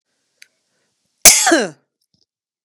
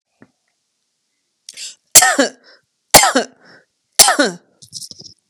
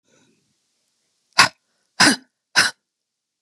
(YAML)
cough_length: 2.6 s
cough_amplitude: 32768
cough_signal_mean_std_ratio: 0.28
three_cough_length: 5.3 s
three_cough_amplitude: 32768
three_cough_signal_mean_std_ratio: 0.31
exhalation_length: 3.4 s
exhalation_amplitude: 32767
exhalation_signal_mean_std_ratio: 0.25
survey_phase: beta (2021-08-13 to 2022-03-07)
age: 45-64
gender: Female
wearing_mask: 'No'
symptom_none: true
smoker_status: Never smoked
respiratory_condition_asthma: true
respiratory_condition_other: false
recruitment_source: REACT
submission_delay: 2 days
covid_test_result: Negative
covid_test_method: RT-qPCR